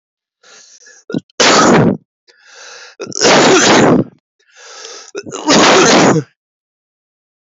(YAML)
three_cough_length: 7.4 s
three_cough_amplitude: 32612
three_cough_signal_mean_std_ratio: 0.53
survey_phase: beta (2021-08-13 to 2022-03-07)
age: 45-64
gender: Male
wearing_mask: 'Yes'
symptom_cough_any: true
symptom_runny_or_blocked_nose: true
symptom_shortness_of_breath: true
symptom_sore_throat: true
symptom_headache: true
symptom_change_to_sense_of_smell_or_taste: true
symptom_other: true
symptom_onset: 2 days
smoker_status: Never smoked
respiratory_condition_asthma: false
respiratory_condition_other: false
recruitment_source: Test and Trace
submission_delay: 2 days
covid_test_result: Positive
covid_test_method: RT-qPCR
covid_ct_value: 17.3
covid_ct_gene: N gene